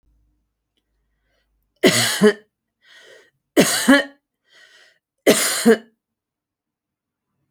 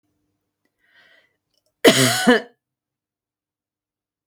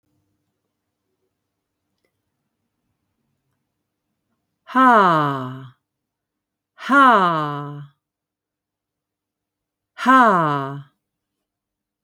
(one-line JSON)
{"three_cough_length": "7.5 s", "three_cough_amplitude": 30517, "three_cough_signal_mean_std_ratio": 0.32, "cough_length": "4.3 s", "cough_amplitude": 28602, "cough_signal_mean_std_ratio": 0.26, "exhalation_length": "12.0 s", "exhalation_amplitude": 24856, "exhalation_signal_mean_std_ratio": 0.34, "survey_phase": "alpha (2021-03-01 to 2021-08-12)", "age": "45-64", "gender": "Female", "wearing_mask": "No", "symptom_none": true, "smoker_status": "Never smoked", "respiratory_condition_asthma": false, "respiratory_condition_other": false, "recruitment_source": "REACT", "submission_delay": "5 days", "covid_test_result": "Negative", "covid_test_method": "RT-qPCR"}